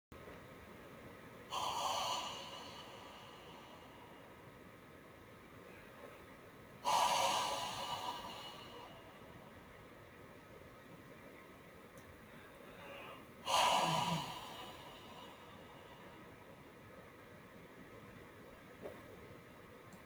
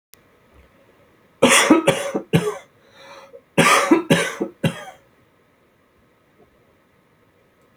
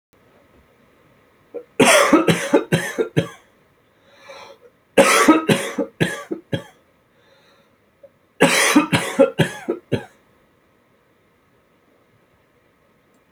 {"exhalation_length": "20.1 s", "exhalation_amplitude": 3050, "exhalation_signal_mean_std_ratio": 0.52, "cough_length": "7.8 s", "cough_amplitude": 31031, "cough_signal_mean_std_ratio": 0.37, "three_cough_length": "13.3 s", "three_cough_amplitude": 29253, "three_cough_signal_mean_std_ratio": 0.38, "survey_phase": "alpha (2021-03-01 to 2021-08-12)", "age": "45-64", "gender": "Male", "wearing_mask": "No", "symptom_none": true, "smoker_status": "Never smoked", "respiratory_condition_asthma": false, "respiratory_condition_other": false, "recruitment_source": "REACT", "submission_delay": "2 days", "covid_test_result": "Negative", "covid_test_method": "RT-qPCR"}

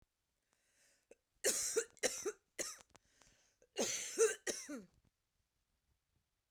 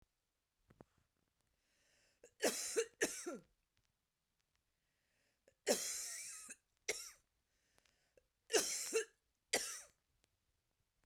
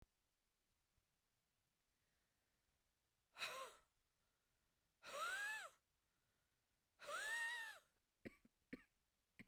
{"cough_length": "6.5 s", "cough_amplitude": 3991, "cough_signal_mean_std_ratio": 0.36, "three_cough_length": "11.1 s", "three_cough_amplitude": 3809, "three_cough_signal_mean_std_ratio": 0.33, "exhalation_length": "9.5 s", "exhalation_amplitude": 550, "exhalation_signal_mean_std_ratio": 0.38, "survey_phase": "beta (2021-08-13 to 2022-03-07)", "age": "45-64", "gender": "Female", "wearing_mask": "No", "symptom_cough_any": true, "symptom_runny_or_blocked_nose": true, "symptom_sore_throat": true, "symptom_fatigue": true, "symptom_fever_high_temperature": true, "symptom_headache": true, "symptom_onset": "2 days", "smoker_status": "Never smoked", "respiratory_condition_asthma": false, "respiratory_condition_other": false, "recruitment_source": "Test and Trace", "submission_delay": "1 day", "covid_test_result": "Positive", "covid_test_method": "RT-qPCR", "covid_ct_value": 16.2, "covid_ct_gene": "ORF1ab gene"}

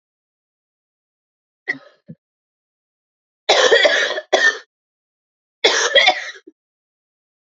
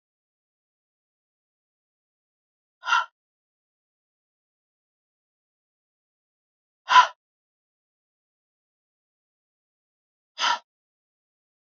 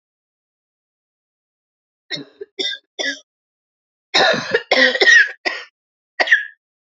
{"three_cough_length": "7.6 s", "three_cough_amplitude": 32768, "three_cough_signal_mean_std_ratio": 0.35, "exhalation_length": "11.8 s", "exhalation_amplitude": 25320, "exhalation_signal_mean_std_ratio": 0.14, "cough_length": "7.0 s", "cough_amplitude": 31514, "cough_signal_mean_std_ratio": 0.36, "survey_phase": "beta (2021-08-13 to 2022-03-07)", "age": "18-44", "gender": "Female", "wearing_mask": "No", "symptom_cough_any": true, "symptom_shortness_of_breath": true, "symptom_sore_throat": true, "symptom_fatigue": true, "symptom_onset": "4 days", "smoker_status": "Never smoked", "respiratory_condition_asthma": false, "respiratory_condition_other": false, "recruitment_source": "Test and Trace", "submission_delay": "1 day", "covid_test_result": "Negative", "covid_test_method": "RT-qPCR"}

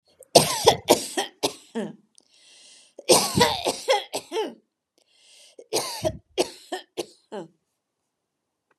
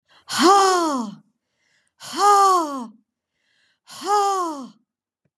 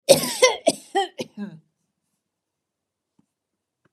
{"three_cough_length": "8.8 s", "three_cough_amplitude": 32767, "three_cough_signal_mean_std_ratio": 0.36, "exhalation_length": "5.4 s", "exhalation_amplitude": 24107, "exhalation_signal_mean_std_ratio": 0.52, "cough_length": "3.9 s", "cough_amplitude": 32762, "cough_signal_mean_std_ratio": 0.28, "survey_phase": "beta (2021-08-13 to 2022-03-07)", "age": "65+", "gender": "Female", "wearing_mask": "No", "symptom_none": true, "smoker_status": "Never smoked", "respiratory_condition_asthma": false, "respiratory_condition_other": false, "recruitment_source": "REACT", "submission_delay": "4 days", "covid_test_result": "Negative", "covid_test_method": "RT-qPCR", "influenza_a_test_result": "Negative", "influenza_b_test_result": "Negative"}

